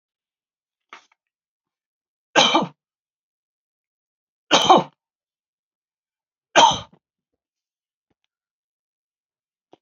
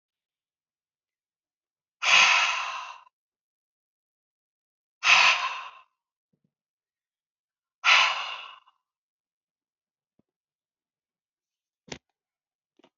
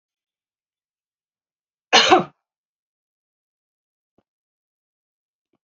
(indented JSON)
{
  "three_cough_length": "9.8 s",
  "three_cough_amplitude": 30420,
  "three_cough_signal_mean_std_ratio": 0.22,
  "exhalation_length": "13.0 s",
  "exhalation_amplitude": 19037,
  "exhalation_signal_mean_std_ratio": 0.27,
  "cough_length": "5.6 s",
  "cough_amplitude": 30008,
  "cough_signal_mean_std_ratio": 0.17,
  "survey_phase": "beta (2021-08-13 to 2022-03-07)",
  "age": "65+",
  "gender": "Female",
  "wearing_mask": "No",
  "symptom_none": true,
  "smoker_status": "Never smoked",
  "respiratory_condition_asthma": false,
  "respiratory_condition_other": false,
  "recruitment_source": "REACT",
  "submission_delay": "2 days",
  "covid_test_result": "Negative",
  "covid_test_method": "RT-qPCR",
  "influenza_a_test_result": "Negative",
  "influenza_b_test_result": "Negative"
}